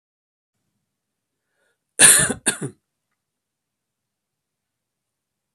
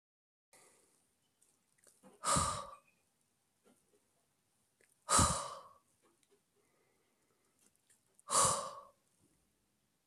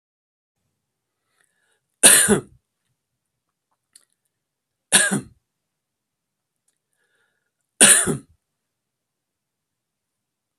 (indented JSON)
{
  "cough_length": "5.5 s",
  "cough_amplitude": 32768,
  "cough_signal_mean_std_ratio": 0.2,
  "exhalation_length": "10.1 s",
  "exhalation_amplitude": 5087,
  "exhalation_signal_mean_std_ratio": 0.27,
  "three_cough_length": "10.6 s",
  "three_cough_amplitude": 32768,
  "three_cough_signal_mean_std_ratio": 0.22,
  "survey_phase": "beta (2021-08-13 to 2022-03-07)",
  "age": "45-64",
  "gender": "Male",
  "wearing_mask": "No",
  "symptom_runny_or_blocked_nose": true,
  "symptom_onset": "8 days",
  "smoker_status": "Ex-smoker",
  "respiratory_condition_asthma": false,
  "respiratory_condition_other": false,
  "recruitment_source": "Test and Trace",
  "submission_delay": "1 day",
  "covid_test_result": "Negative",
  "covid_test_method": "RT-qPCR"
}